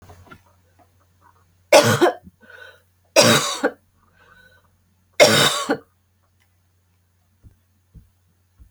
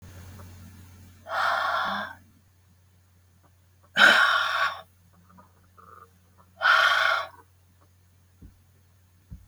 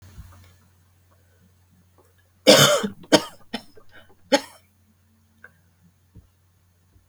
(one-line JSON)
{"three_cough_length": "8.7 s", "three_cough_amplitude": 32768, "three_cough_signal_mean_std_ratio": 0.3, "exhalation_length": "9.5 s", "exhalation_amplitude": 21820, "exhalation_signal_mean_std_ratio": 0.4, "cough_length": "7.1 s", "cough_amplitude": 32768, "cough_signal_mean_std_ratio": 0.23, "survey_phase": "beta (2021-08-13 to 2022-03-07)", "age": "45-64", "gender": "Female", "wearing_mask": "No", "symptom_cough_any": true, "symptom_runny_or_blocked_nose": true, "symptom_shortness_of_breath": true, "symptom_sore_throat": true, "symptom_fatigue": true, "symptom_fever_high_temperature": true, "symptom_change_to_sense_of_smell_or_taste": true, "symptom_other": true, "symptom_onset": "2 days", "smoker_status": "Never smoked", "respiratory_condition_asthma": false, "respiratory_condition_other": false, "recruitment_source": "Test and Trace", "submission_delay": "1 day", "covid_test_result": "Positive", "covid_test_method": "RT-qPCR", "covid_ct_value": 18.1, "covid_ct_gene": "ORF1ab gene", "covid_ct_mean": 18.6, "covid_viral_load": "810000 copies/ml", "covid_viral_load_category": "Low viral load (10K-1M copies/ml)"}